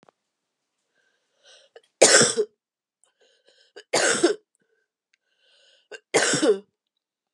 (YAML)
three_cough_length: 7.3 s
three_cough_amplitude: 28646
three_cough_signal_mean_std_ratio: 0.31
survey_phase: beta (2021-08-13 to 2022-03-07)
age: 45-64
gender: Female
wearing_mask: 'No'
symptom_cough_any: true
symptom_new_continuous_cough: true
symptom_runny_or_blocked_nose: true
symptom_shortness_of_breath: true
symptom_onset: 3 days
smoker_status: Ex-smoker
respiratory_condition_asthma: false
respiratory_condition_other: false
recruitment_source: Test and Trace
submission_delay: 1 day
covid_test_result: Positive
covid_test_method: RT-qPCR
covid_ct_value: 25.7
covid_ct_gene: N gene